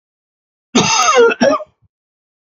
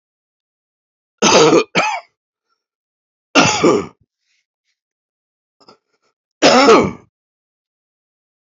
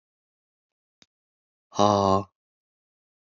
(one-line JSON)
{"cough_length": "2.5 s", "cough_amplitude": 30996, "cough_signal_mean_std_ratio": 0.49, "three_cough_length": "8.4 s", "three_cough_amplitude": 32115, "three_cough_signal_mean_std_ratio": 0.35, "exhalation_length": "3.3 s", "exhalation_amplitude": 17750, "exhalation_signal_mean_std_ratio": 0.26, "survey_phase": "beta (2021-08-13 to 2022-03-07)", "age": "45-64", "gender": "Male", "wearing_mask": "No", "symptom_runny_or_blocked_nose": true, "symptom_sore_throat": true, "smoker_status": "Never smoked", "respiratory_condition_asthma": false, "respiratory_condition_other": false, "recruitment_source": "Test and Trace", "submission_delay": "1 day", "covid_test_result": "Positive", "covid_test_method": "LFT"}